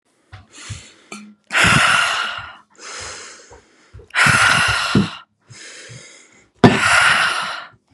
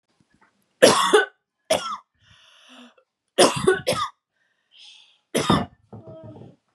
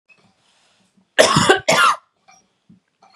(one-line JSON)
{"exhalation_length": "7.9 s", "exhalation_amplitude": 32768, "exhalation_signal_mean_std_ratio": 0.52, "three_cough_length": "6.7 s", "three_cough_amplitude": 32664, "three_cough_signal_mean_std_ratio": 0.35, "cough_length": "3.2 s", "cough_amplitude": 32768, "cough_signal_mean_std_ratio": 0.37, "survey_phase": "beta (2021-08-13 to 2022-03-07)", "age": "18-44", "gender": "Female", "wearing_mask": "No", "symptom_sore_throat": true, "symptom_fatigue": true, "smoker_status": "Never smoked", "respiratory_condition_asthma": false, "respiratory_condition_other": false, "recruitment_source": "REACT", "submission_delay": "1 day", "covid_test_result": "Negative", "covid_test_method": "RT-qPCR", "influenza_a_test_result": "Negative", "influenza_b_test_result": "Negative"}